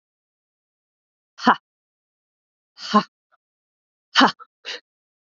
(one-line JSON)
{"exhalation_length": "5.4 s", "exhalation_amplitude": 27501, "exhalation_signal_mean_std_ratio": 0.21, "survey_phase": "beta (2021-08-13 to 2022-03-07)", "age": "18-44", "gender": "Female", "wearing_mask": "No", "symptom_runny_or_blocked_nose": true, "symptom_sore_throat": true, "symptom_diarrhoea": true, "symptom_fatigue": true, "symptom_onset": "4 days", "smoker_status": "Never smoked", "respiratory_condition_asthma": false, "respiratory_condition_other": false, "recruitment_source": "Test and Trace", "submission_delay": "1 day", "covid_test_result": "Positive", "covid_test_method": "RT-qPCR", "covid_ct_value": 18.9, "covid_ct_gene": "ORF1ab gene", "covid_ct_mean": 19.5, "covid_viral_load": "410000 copies/ml", "covid_viral_load_category": "Low viral load (10K-1M copies/ml)"}